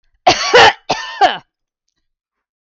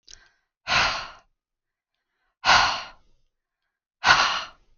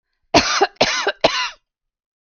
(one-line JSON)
{"cough_length": "2.6 s", "cough_amplitude": 32768, "cough_signal_mean_std_ratio": 0.4, "exhalation_length": "4.8 s", "exhalation_amplitude": 26684, "exhalation_signal_mean_std_ratio": 0.37, "three_cough_length": "2.2 s", "three_cough_amplitude": 32768, "three_cough_signal_mean_std_ratio": 0.46, "survey_phase": "beta (2021-08-13 to 2022-03-07)", "age": "45-64", "gender": "Female", "wearing_mask": "No", "symptom_headache": true, "symptom_onset": "13 days", "smoker_status": "Ex-smoker", "respiratory_condition_asthma": false, "respiratory_condition_other": false, "recruitment_source": "REACT", "submission_delay": "2 days", "covid_test_result": "Negative", "covid_test_method": "RT-qPCR", "influenza_a_test_result": "Negative", "influenza_b_test_result": "Negative"}